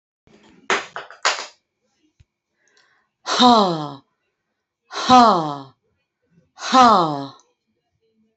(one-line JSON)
{"exhalation_length": "8.4 s", "exhalation_amplitude": 28515, "exhalation_signal_mean_std_ratio": 0.35, "survey_phase": "beta (2021-08-13 to 2022-03-07)", "age": "65+", "gender": "Female", "wearing_mask": "No", "symptom_none": true, "smoker_status": "Ex-smoker", "respiratory_condition_asthma": false, "respiratory_condition_other": false, "recruitment_source": "REACT", "submission_delay": "2 days", "covid_test_result": "Negative", "covid_test_method": "RT-qPCR", "influenza_a_test_result": "Negative", "influenza_b_test_result": "Negative"}